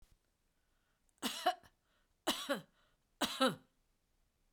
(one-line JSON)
{"three_cough_length": "4.5 s", "three_cough_amplitude": 3459, "three_cough_signal_mean_std_ratio": 0.32, "survey_phase": "beta (2021-08-13 to 2022-03-07)", "age": "65+", "gender": "Female", "wearing_mask": "No", "symptom_none": true, "smoker_status": "Ex-smoker", "respiratory_condition_asthma": false, "respiratory_condition_other": false, "recruitment_source": "REACT", "submission_delay": "3 days", "covid_test_result": "Negative", "covid_test_method": "RT-qPCR"}